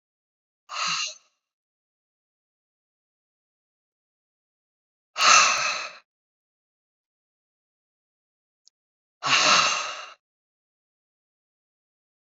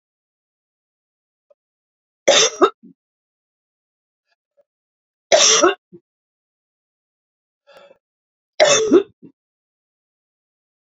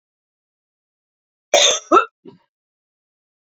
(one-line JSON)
{"exhalation_length": "12.3 s", "exhalation_amplitude": 29315, "exhalation_signal_mean_std_ratio": 0.27, "three_cough_length": "10.8 s", "three_cough_amplitude": 32768, "three_cough_signal_mean_std_ratio": 0.26, "cough_length": "3.5 s", "cough_amplitude": 29044, "cough_signal_mean_std_ratio": 0.25, "survey_phase": "beta (2021-08-13 to 2022-03-07)", "age": "65+", "gender": "Female", "wearing_mask": "No", "symptom_none": true, "smoker_status": "Never smoked", "respiratory_condition_asthma": false, "respiratory_condition_other": false, "recruitment_source": "REACT", "submission_delay": "2 days", "covid_test_result": "Negative", "covid_test_method": "RT-qPCR", "influenza_a_test_result": "Negative", "influenza_b_test_result": "Negative"}